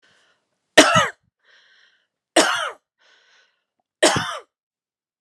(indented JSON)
{
  "three_cough_length": "5.2 s",
  "three_cough_amplitude": 32768,
  "three_cough_signal_mean_std_ratio": 0.3,
  "survey_phase": "beta (2021-08-13 to 2022-03-07)",
  "age": "45-64",
  "gender": "Female",
  "wearing_mask": "No",
  "symptom_none": true,
  "symptom_onset": "8 days",
  "smoker_status": "Ex-smoker",
  "respiratory_condition_asthma": false,
  "respiratory_condition_other": false,
  "recruitment_source": "REACT",
  "submission_delay": "1 day",
  "covid_test_result": "Negative",
  "covid_test_method": "RT-qPCR"
}